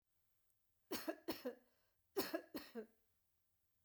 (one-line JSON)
{"cough_length": "3.8 s", "cough_amplitude": 1328, "cough_signal_mean_std_ratio": 0.37, "survey_phase": "beta (2021-08-13 to 2022-03-07)", "age": "45-64", "gender": "Female", "wearing_mask": "No", "symptom_none": true, "smoker_status": "Never smoked", "respiratory_condition_asthma": false, "respiratory_condition_other": false, "recruitment_source": "REACT", "submission_delay": "2 days", "covid_test_result": "Negative", "covid_test_method": "RT-qPCR"}